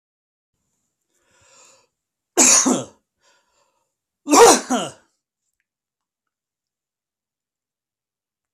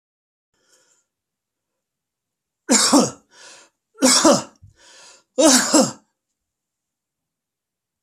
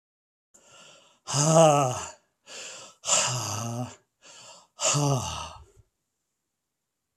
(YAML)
cough_length: 8.5 s
cough_amplitude: 32767
cough_signal_mean_std_ratio: 0.25
three_cough_length: 8.0 s
three_cough_amplitude: 32254
three_cough_signal_mean_std_ratio: 0.32
exhalation_length: 7.2 s
exhalation_amplitude: 18958
exhalation_signal_mean_std_ratio: 0.41
survey_phase: alpha (2021-03-01 to 2021-08-12)
age: 65+
gender: Male
wearing_mask: 'No'
symptom_none: true
smoker_status: Never smoked
respiratory_condition_asthma: false
respiratory_condition_other: false
recruitment_source: REACT
submission_delay: 1 day
covid_test_result: Negative
covid_test_method: RT-qPCR